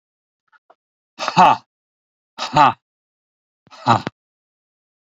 exhalation_length: 5.1 s
exhalation_amplitude: 27940
exhalation_signal_mean_std_ratio: 0.27
survey_phase: beta (2021-08-13 to 2022-03-07)
age: 65+
gender: Male
wearing_mask: 'No'
symptom_none: true
smoker_status: Ex-smoker
respiratory_condition_asthma: false
respiratory_condition_other: false
recruitment_source: REACT
submission_delay: 1 day
covid_test_result: Negative
covid_test_method: RT-qPCR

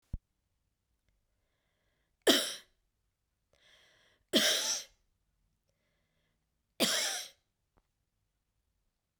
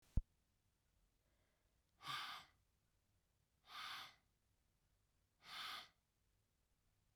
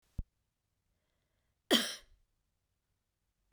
three_cough_length: 9.2 s
three_cough_amplitude: 10128
three_cough_signal_mean_std_ratio: 0.27
exhalation_length: 7.2 s
exhalation_amplitude: 2011
exhalation_signal_mean_std_ratio: 0.27
cough_length: 3.5 s
cough_amplitude: 8010
cough_signal_mean_std_ratio: 0.19
survey_phase: beta (2021-08-13 to 2022-03-07)
age: 45-64
gender: Female
wearing_mask: 'No'
symptom_cough_any: true
symptom_shortness_of_breath: true
symptom_sore_throat: true
symptom_fatigue: true
symptom_headache: true
symptom_onset: 3 days
smoker_status: Never smoked
respiratory_condition_asthma: false
respiratory_condition_other: false
recruitment_source: Test and Trace
submission_delay: 2 days
covid_test_result: Positive
covid_test_method: RT-qPCR
covid_ct_value: 14.9
covid_ct_gene: ORF1ab gene
covid_ct_mean: 15.4
covid_viral_load: 8800000 copies/ml
covid_viral_load_category: High viral load (>1M copies/ml)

